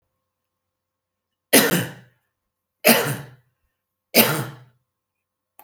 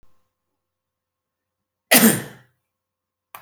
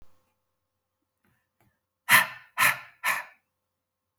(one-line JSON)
{"three_cough_length": "5.6 s", "three_cough_amplitude": 32768, "three_cough_signal_mean_std_ratio": 0.3, "cough_length": "3.4 s", "cough_amplitude": 32768, "cough_signal_mean_std_ratio": 0.23, "exhalation_length": "4.2 s", "exhalation_amplitude": 20715, "exhalation_signal_mean_std_ratio": 0.27, "survey_phase": "beta (2021-08-13 to 2022-03-07)", "age": "45-64", "gender": "Male", "wearing_mask": "No", "symptom_none": true, "smoker_status": "Ex-smoker", "respiratory_condition_asthma": false, "respiratory_condition_other": false, "recruitment_source": "REACT", "submission_delay": "1 day", "covid_test_result": "Negative", "covid_test_method": "RT-qPCR"}